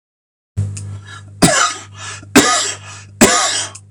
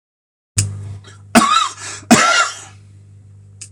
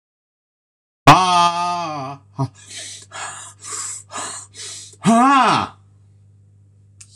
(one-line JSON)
{"three_cough_length": "3.9 s", "three_cough_amplitude": 26028, "three_cough_signal_mean_std_ratio": 0.53, "cough_length": "3.7 s", "cough_amplitude": 26028, "cough_signal_mean_std_ratio": 0.46, "exhalation_length": "7.2 s", "exhalation_amplitude": 26028, "exhalation_signal_mean_std_ratio": 0.42, "survey_phase": "beta (2021-08-13 to 2022-03-07)", "age": "45-64", "gender": "Male", "wearing_mask": "No", "symptom_none": true, "smoker_status": "Ex-smoker", "respiratory_condition_asthma": false, "respiratory_condition_other": false, "recruitment_source": "REACT", "submission_delay": "1 day", "covid_test_result": "Negative", "covid_test_method": "RT-qPCR", "influenza_a_test_result": "Negative", "influenza_b_test_result": "Negative"}